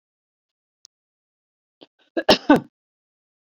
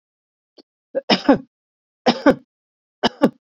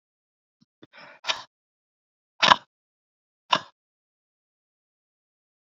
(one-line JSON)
{"cough_length": "3.6 s", "cough_amplitude": 27809, "cough_signal_mean_std_ratio": 0.18, "three_cough_length": "3.6 s", "three_cough_amplitude": 28928, "three_cough_signal_mean_std_ratio": 0.29, "exhalation_length": "5.7 s", "exhalation_amplitude": 27675, "exhalation_signal_mean_std_ratio": 0.14, "survey_phase": "beta (2021-08-13 to 2022-03-07)", "age": "45-64", "gender": "Female", "wearing_mask": "No", "symptom_none": true, "smoker_status": "Current smoker (e-cigarettes or vapes only)", "respiratory_condition_asthma": true, "respiratory_condition_other": false, "recruitment_source": "REACT", "submission_delay": "0 days", "covid_test_result": "Negative", "covid_test_method": "RT-qPCR"}